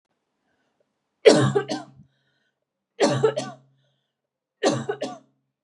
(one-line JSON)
{"three_cough_length": "5.6 s", "three_cough_amplitude": 32420, "three_cough_signal_mean_std_ratio": 0.33, "survey_phase": "beta (2021-08-13 to 2022-03-07)", "age": "18-44", "gender": "Female", "wearing_mask": "No", "symptom_cough_any": true, "smoker_status": "Never smoked", "respiratory_condition_asthma": false, "respiratory_condition_other": false, "recruitment_source": "REACT", "submission_delay": "1 day", "covid_test_result": "Negative", "covid_test_method": "RT-qPCR", "influenza_a_test_result": "Negative", "influenza_b_test_result": "Negative"}